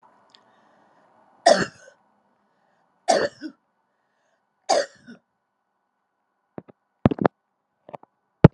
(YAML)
three_cough_length: 8.5 s
three_cough_amplitude: 32768
three_cough_signal_mean_std_ratio: 0.19
survey_phase: alpha (2021-03-01 to 2021-08-12)
age: 65+
gender: Female
wearing_mask: 'No'
symptom_fatigue: true
symptom_headache: true
smoker_status: Never smoked
respiratory_condition_asthma: false
respiratory_condition_other: false
recruitment_source: REACT
submission_delay: 1 day
covid_test_result: Negative
covid_test_method: RT-qPCR